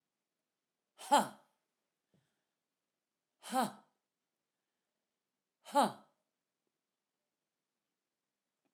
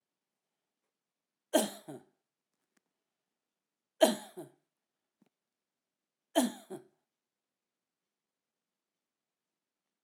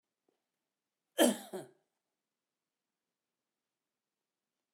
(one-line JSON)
{"exhalation_length": "8.7 s", "exhalation_amplitude": 5261, "exhalation_signal_mean_std_ratio": 0.18, "three_cough_length": "10.0 s", "three_cough_amplitude": 10691, "three_cough_signal_mean_std_ratio": 0.17, "cough_length": "4.7 s", "cough_amplitude": 7050, "cough_signal_mean_std_ratio": 0.16, "survey_phase": "alpha (2021-03-01 to 2021-08-12)", "age": "65+", "gender": "Male", "wearing_mask": "No", "symptom_none": true, "smoker_status": "Ex-smoker", "respiratory_condition_asthma": false, "respiratory_condition_other": false, "recruitment_source": "REACT", "submission_delay": "1 day", "covid_test_result": "Negative", "covid_test_method": "RT-qPCR"}